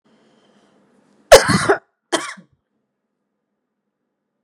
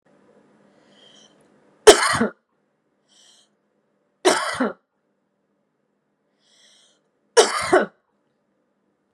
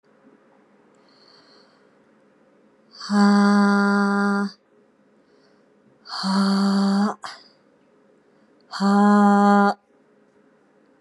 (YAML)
cough_length: 4.4 s
cough_amplitude: 32768
cough_signal_mean_std_ratio: 0.22
three_cough_length: 9.1 s
three_cough_amplitude: 32768
three_cough_signal_mean_std_ratio: 0.24
exhalation_length: 11.0 s
exhalation_amplitude: 19179
exhalation_signal_mean_std_ratio: 0.5
survey_phase: beta (2021-08-13 to 2022-03-07)
age: 45-64
gender: Female
wearing_mask: 'No'
symptom_cough_any: true
symptom_runny_or_blocked_nose: true
symptom_shortness_of_breath: true
symptom_sore_throat: true
symptom_fatigue: true
symptom_onset: 8 days
smoker_status: Never smoked
respiratory_condition_asthma: false
respiratory_condition_other: false
recruitment_source: REACT
submission_delay: 2 days
covid_test_result: Positive
covid_test_method: RT-qPCR
covid_ct_value: 23.0
covid_ct_gene: E gene
influenza_a_test_result: Negative
influenza_b_test_result: Negative